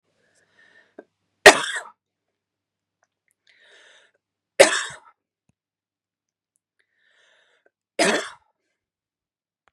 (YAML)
three_cough_length: 9.7 s
three_cough_amplitude: 32768
three_cough_signal_mean_std_ratio: 0.16
survey_phase: beta (2021-08-13 to 2022-03-07)
age: 18-44
gender: Female
wearing_mask: 'No'
symptom_none: true
smoker_status: Never smoked
respiratory_condition_asthma: false
respiratory_condition_other: false
recruitment_source: REACT
submission_delay: 1 day
covid_test_result: Negative
covid_test_method: RT-qPCR
influenza_a_test_result: Negative
influenza_b_test_result: Negative